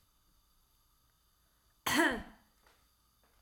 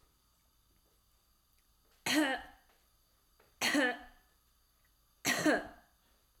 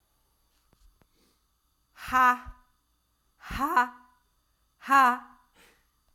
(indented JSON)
{
  "cough_length": "3.4 s",
  "cough_amplitude": 5106,
  "cough_signal_mean_std_ratio": 0.27,
  "three_cough_length": "6.4 s",
  "three_cough_amplitude": 4204,
  "three_cough_signal_mean_std_ratio": 0.35,
  "exhalation_length": "6.1 s",
  "exhalation_amplitude": 13050,
  "exhalation_signal_mean_std_ratio": 0.3,
  "survey_phase": "beta (2021-08-13 to 2022-03-07)",
  "age": "18-44",
  "gender": "Female",
  "wearing_mask": "No",
  "symptom_cough_any": true,
  "symptom_runny_or_blocked_nose": true,
  "symptom_sore_throat": true,
  "symptom_change_to_sense_of_smell_or_taste": true,
  "smoker_status": "Never smoked",
  "respiratory_condition_asthma": false,
  "respiratory_condition_other": false,
  "recruitment_source": "Test and Trace",
  "submission_delay": "2 days",
  "covid_test_result": "Positive",
  "covid_test_method": "RT-qPCR",
  "covid_ct_value": 29.5,
  "covid_ct_gene": "ORF1ab gene",
  "covid_ct_mean": 30.1,
  "covid_viral_load": "130 copies/ml",
  "covid_viral_load_category": "Minimal viral load (< 10K copies/ml)"
}